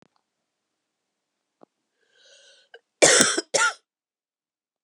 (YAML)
cough_length: 4.8 s
cough_amplitude: 32768
cough_signal_mean_std_ratio: 0.25
survey_phase: beta (2021-08-13 to 2022-03-07)
age: 45-64
gender: Female
wearing_mask: 'No'
symptom_cough_any: true
symptom_new_continuous_cough: true
symptom_runny_or_blocked_nose: true
symptom_shortness_of_breath: true
symptom_onset: 3 days
smoker_status: Ex-smoker
respiratory_condition_asthma: false
respiratory_condition_other: false
recruitment_source: Test and Trace
submission_delay: 1 day
covid_test_result: Positive
covid_test_method: RT-qPCR
covid_ct_value: 25.7
covid_ct_gene: N gene